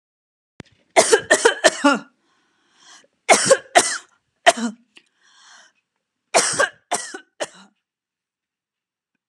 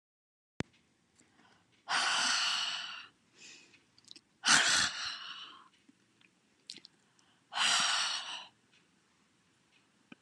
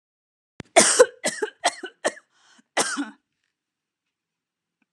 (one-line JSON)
{"three_cough_length": "9.3 s", "three_cough_amplitude": 32767, "three_cough_signal_mean_std_ratio": 0.32, "exhalation_length": "10.2 s", "exhalation_amplitude": 8709, "exhalation_signal_mean_std_ratio": 0.41, "cough_length": "4.9 s", "cough_amplitude": 30653, "cough_signal_mean_std_ratio": 0.28, "survey_phase": "alpha (2021-03-01 to 2021-08-12)", "age": "45-64", "gender": "Female", "wearing_mask": "No", "symptom_none": true, "smoker_status": "Never smoked", "respiratory_condition_asthma": false, "respiratory_condition_other": false, "recruitment_source": "REACT", "submission_delay": "1 day", "covid_test_result": "Negative", "covid_test_method": "RT-qPCR"}